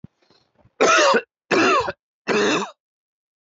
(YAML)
three_cough_length: 3.5 s
three_cough_amplitude: 25232
three_cough_signal_mean_std_ratio: 0.5
survey_phase: alpha (2021-03-01 to 2021-08-12)
age: 18-44
gender: Male
wearing_mask: 'No'
symptom_none: true
symptom_onset: 5 days
smoker_status: Ex-smoker
respiratory_condition_asthma: false
respiratory_condition_other: false
recruitment_source: REACT
submission_delay: 4 days
covid_test_result: Negative
covid_test_method: RT-qPCR